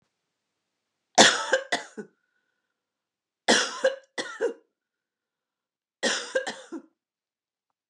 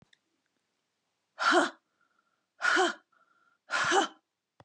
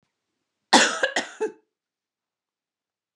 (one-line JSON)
{"three_cough_length": "7.9 s", "three_cough_amplitude": 28655, "three_cough_signal_mean_std_ratio": 0.29, "exhalation_length": "4.6 s", "exhalation_amplitude": 8730, "exhalation_signal_mean_std_ratio": 0.37, "cough_length": "3.2 s", "cough_amplitude": 26718, "cough_signal_mean_std_ratio": 0.28, "survey_phase": "beta (2021-08-13 to 2022-03-07)", "age": "65+", "gender": "Female", "wearing_mask": "No", "symptom_none": true, "smoker_status": "Ex-smoker", "respiratory_condition_asthma": false, "respiratory_condition_other": false, "recruitment_source": "REACT", "submission_delay": "2 days", "covid_test_result": "Negative", "covid_test_method": "RT-qPCR", "influenza_a_test_result": "Negative", "influenza_b_test_result": "Negative"}